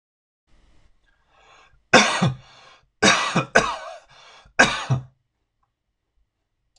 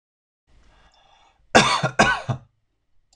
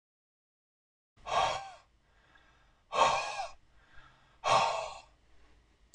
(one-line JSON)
{"three_cough_length": "6.8 s", "three_cough_amplitude": 26028, "three_cough_signal_mean_std_ratio": 0.33, "cough_length": "3.2 s", "cough_amplitude": 26027, "cough_signal_mean_std_ratio": 0.33, "exhalation_length": "5.9 s", "exhalation_amplitude": 7472, "exhalation_signal_mean_std_ratio": 0.38, "survey_phase": "beta (2021-08-13 to 2022-03-07)", "age": "45-64", "gender": "Male", "wearing_mask": "No", "symptom_none": true, "smoker_status": "Never smoked", "respiratory_condition_asthma": false, "respiratory_condition_other": false, "recruitment_source": "REACT", "submission_delay": "1 day", "covid_test_result": "Negative", "covid_test_method": "RT-qPCR"}